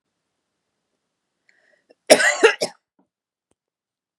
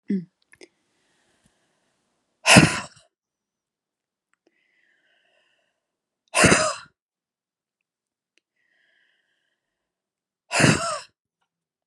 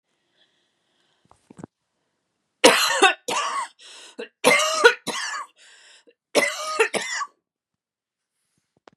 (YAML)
cough_length: 4.2 s
cough_amplitude: 32768
cough_signal_mean_std_ratio: 0.22
exhalation_length: 11.9 s
exhalation_amplitude: 32767
exhalation_signal_mean_std_ratio: 0.23
three_cough_length: 9.0 s
three_cough_amplitude: 32738
three_cough_signal_mean_std_ratio: 0.36
survey_phase: beta (2021-08-13 to 2022-03-07)
age: 45-64
gender: Female
wearing_mask: 'No'
symptom_none: true
smoker_status: Never smoked
respiratory_condition_asthma: false
respiratory_condition_other: false
recruitment_source: REACT
submission_delay: 1 day
covid_test_result: Negative
covid_test_method: RT-qPCR
influenza_a_test_result: Unknown/Void
influenza_b_test_result: Unknown/Void